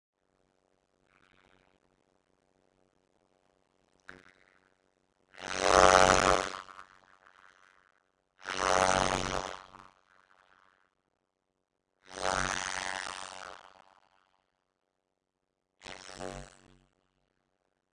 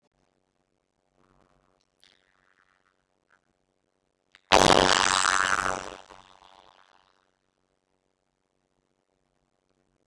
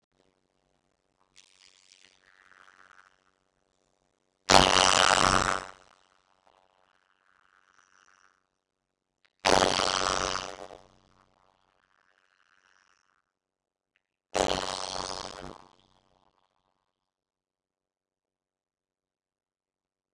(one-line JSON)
{"exhalation_length": "17.9 s", "exhalation_amplitude": 18555, "exhalation_signal_mean_std_ratio": 0.16, "cough_length": "10.1 s", "cough_amplitude": 31831, "cough_signal_mean_std_ratio": 0.14, "three_cough_length": "20.1 s", "three_cough_amplitude": 28009, "three_cough_signal_mean_std_ratio": 0.14, "survey_phase": "beta (2021-08-13 to 2022-03-07)", "age": "45-64", "gender": "Female", "wearing_mask": "No", "symptom_cough_any": true, "symptom_fatigue": true, "symptom_headache": true, "symptom_onset": "12 days", "smoker_status": "Never smoked", "respiratory_condition_asthma": false, "respiratory_condition_other": false, "recruitment_source": "REACT", "submission_delay": "1 day", "covid_test_result": "Negative", "covid_test_method": "RT-qPCR", "influenza_a_test_result": "Negative", "influenza_b_test_result": "Negative"}